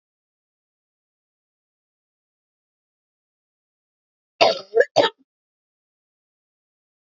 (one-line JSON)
{"cough_length": "7.1 s", "cough_amplitude": 28968, "cough_signal_mean_std_ratio": 0.17, "survey_phase": "beta (2021-08-13 to 2022-03-07)", "age": "18-44", "gender": "Female", "wearing_mask": "No", "symptom_cough_any": true, "symptom_new_continuous_cough": true, "symptom_runny_or_blocked_nose": true, "symptom_shortness_of_breath": true, "symptom_sore_throat": true, "symptom_abdominal_pain": true, "symptom_change_to_sense_of_smell_or_taste": true, "symptom_loss_of_taste": true, "smoker_status": "Never smoked", "respiratory_condition_asthma": false, "respiratory_condition_other": false, "recruitment_source": "Test and Trace", "submission_delay": "3 days", "covid_test_result": "Positive", "covid_test_method": "ePCR"}